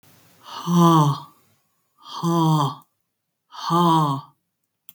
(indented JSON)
{
  "exhalation_length": "4.9 s",
  "exhalation_amplitude": 21640,
  "exhalation_signal_mean_std_ratio": 0.5,
  "survey_phase": "beta (2021-08-13 to 2022-03-07)",
  "age": "45-64",
  "gender": "Female",
  "wearing_mask": "No",
  "symptom_runny_or_blocked_nose": true,
  "symptom_fatigue": true,
  "smoker_status": "Never smoked",
  "respiratory_condition_asthma": false,
  "respiratory_condition_other": false,
  "recruitment_source": "REACT",
  "submission_delay": "1 day",
  "covid_test_result": "Negative",
  "covid_test_method": "RT-qPCR",
  "influenza_a_test_result": "Negative",
  "influenza_b_test_result": "Negative"
}